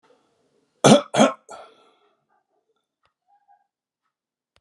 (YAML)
cough_length: 4.6 s
cough_amplitude: 32749
cough_signal_mean_std_ratio: 0.21
survey_phase: alpha (2021-03-01 to 2021-08-12)
age: 65+
gender: Male
wearing_mask: 'No'
symptom_none: true
smoker_status: Ex-smoker
respiratory_condition_asthma: false
respiratory_condition_other: false
recruitment_source: REACT
submission_delay: 2 days
covid_test_result: Negative
covid_test_method: RT-qPCR